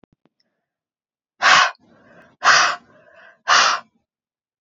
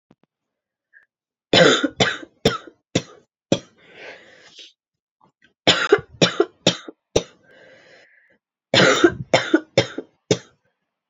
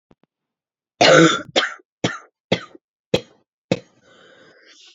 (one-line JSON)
{"exhalation_length": "4.6 s", "exhalation_amplitude": 29973, "exhalation_signal_mean_std_ratio": 0.36, "three_cough_length": "11.1 s", "three_cough_amplitude": 32767, "three_cough_signal_mean_std_ratio": 0.33, "cough_length": "4.9 s", "cough_amplitude": 30094, "cough_signal_mean_std_ratio": 0.3, "survey_phase": "beta (2021-08-13 to 2022-03-07)", "age": "18-44", "gender": "Female", "wearing_mask": "No", "symptom_cough_any": true, "symptom_runny_or_blocked_nose": true, "symptom_sore_throat": true, "symptom_fatigue": true, "symptom_fever_high_temperature": true, "symptom_headache": true, "symptom_change_to_sense_of_smell_or_taste": true, "symptom_loss_of_taste": true, "smoker_status": "Never smoked", "respiratory_condition_asthma": false, "respiratory_condition_other": false, "recruitment_source": "Test and Trace", "submission_delay": "2 days", "covid_test_result": "Positive", "covid_test_method": "RT-qPCR", "covid_ct_value": 17.4, "covid_ct_gene": "ORF1ab gene", "covid_ct_mean": 17.8, "covid_viral_load": "1400000 copies/ml", "covid_viral_load_category": "High viral load (>1M copies/ml)"}